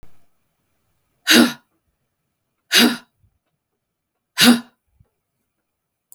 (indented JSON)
{
  "exhalation_length": "6.1 s",
  "exhalation_amplitude": 32768,
  "exhalation_signal_mean_std_ratio": 0.26,
  "survey_phase": "beta (2021-08-13 to 2022-03-07)",
  "age": "45-64",
  "gender": "Female",
  "wearing_mask": "No",
  "symptom_cough_any": true,
  "symptom_runny_or_blocked_nose": true,
  "symptom_shortness_of_breath": true,
  "symptom_fatigue": true,
  "symptom_onset": "11 days",
  "smoker_status": "Never smoked",
  "respiratory_condition_asthma": false,
  "respiratory_condition_other": false,
  "recruitment_source": "REACT",
  "submission_delay": "3 days",
  "covid_test_result": "Negative",
  "covid_test_method": "RT-qPCR",
  "influenza_a_test_result": "Unknown/Void",
  "influenza_b_test_result": "Unknown/Void"
}